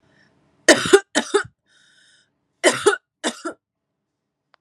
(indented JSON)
{
  "cough_length": "4.6 s",
  "cough_amplitude": 32768,
  "cough_signal_mean_std_ratio": 0.29,
  "survey_phase": "alpha (2021-03-01 to 2021-08-12)",
  "age": "18-44",
  "gender": "Female",
  "wearing_mask": "No",
  "symptom_cough_any": true,
  "symptom_shortness_of_breath": true,
  "symptom_fatigue": true,
  "symptom_change_to_sense_of_smell_or_taste": true,
  "symptom_loss_of_taste": true,
  "symptom_onset": "7 days",
  "smoker_status": "Never smoked",
  "respiratory_condition_asthma": false,
  "respiratory_condition_other": false,
  "recruitment_source": "Test and Trace",
  "submission_delay": "2 days",
  "covid_test_result": "Positive",
  "covid_test_method": "RT-qPCR",
  "covid_ct_value": 20.3,
  "covid_ct_gene": "ORF1ab gene",
  "covid_ct_mean": 21.2,
  "covid_viral_load": "110000 copies/ml",
  "covid_viral_load_category": "Low viral load (10K-1M copies/ml)"
}